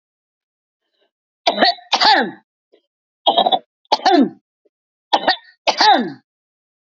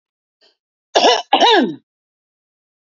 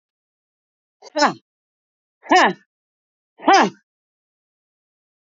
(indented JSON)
{
  "three_cough_length": "6.8 s",
  "three_cough_amplitude": 32712,
  "three_cough_signal_mean_std_ratio": 0.4,
  "cough_length": "2.8 s",
  "cough_amplitude": 30855,
  "cough_signal_mean_std_ratio": 0.39,
  "exhalation_length": "5.2 s",
  "exhalation_amplitude": 29300,
  "exhalation_signal_mean_std_ratio": 0.26,
  "survey_phase": "beta (2021-08-13 to 2022-03-07)",
  "age": "65+",
  "gender": "Female",
  "wearing_mask": "No",
  "symptom_cough_any": true,
  "smoker_status": "Current smoker (11 or more cigarettes per day)",
  "respiratory_condition_asthma": false,
  "respiratory_condition_other": false,
  "recruitment_source": "REACT",
  "submission_delay": "3 days",
  "covid_test_result": "Negative",
  "covid_test_method": "RT-qPCR",
  "influenza_a_test_result": "Negative",
  "influenza_b_test_result": "Negative"
}